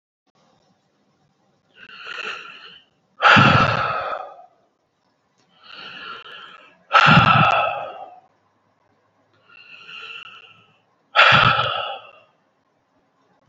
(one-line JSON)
{"exhalation_length": "13.5 s", "exhalation_amplitude": 29132, "exhalation_signal_mean_std_ratio": 0.36, "survey_phase": "beta (2021-08-13 to 2022-03-07)", "age": "18-44", "gender": "Male", "wearing_mask": "No", "symptom_cough_any": true, "symptom_runny_or_blocked_nose": true, "symptom_sore_throat": true, "symptom_headache": true, "symptom_onset": "3 days", "smoker_status": "Never smoked", "respiratory_condition_asthma": true, "respiratory_condition_other": false, "recruitment_source": "REACT", "submission_delay": "1 day", "covid_test_result": "Positive", "covid_test_method": "RT-qPCR", "covid_ct_value": 19.0, "covid_ct_gene": "E gene", "influenza_a_test_result": "Negative", "influenza_b_test_result": "Negative"}